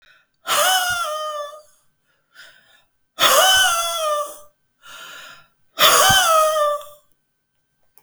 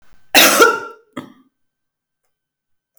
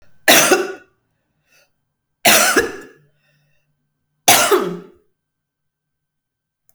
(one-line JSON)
{"exhalation_length": "8.0 s", "exhalation_amplitude": 31107, "exhalation_signal_mean_std_ratio": 0.53, "cough_length": "3.0 s", "cough_amplitude": 32768, "cough_signal_mean_std_ratio": 0.33, "three_cough_length": "6.7 s", "three_cough_amplitude": 32768, "three_cough_signal_mean_std_ratio": 0.35, "survey_phase": "alpha (2021-03-01 to 2021-08-12)", "age": "65+", "gender": "Female", "wearing_mask": "No", "symptom_none": true, "symptom_onset": "9 days", "smoker_status": "Never smoked", "respiratory_condition_asthma": true, "respiratory_condition_other": false, "recruitment_source": "REACT", "submission_delay": "2 days", "covid_test_result": "Negative", "covid_test_method": "RT-qPCR"}